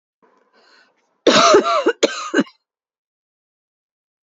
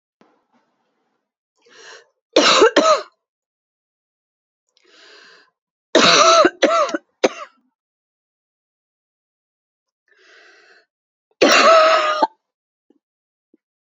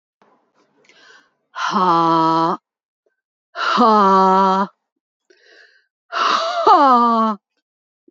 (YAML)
cough_length: 4.3 s
cough_amplitude: 29514
cough_signal_mean_std_ratio: 0.36
three_cough_length: 14.0 s
three_cough_amplitude: 32610
three_cough_signal_mean_std_ratio: 0.33
exhalation_length: 8.1 s
exhalation_amplitude: 29458
exhalation_signal_mean_std_ratio: 0.53
survey_phase: beta (2021-08-13 to 2022-03-07)
age: 45-64
gender: Female
wearing_mask: 'Yes'
symptom_cough_any: true
symptom_runny_or_blocked_nose: true
symptom_shortness_of_breath: true
symptom_sore_throat: true
symptom_abdominal_pain: true
symptom_fatigue: true
symptom_headache: true
symptom_other: true
smoker_status: Ex-smoker
respiratory_condition_asthma: false
respiratory_condition_other: false
recruitment_source: Test and Trace
submission_delay: 2 days
covid_test_result: Positive
covid_test_method: RT-qPCR
covid_ct_value: 36.3
covid_ct_gene: N gene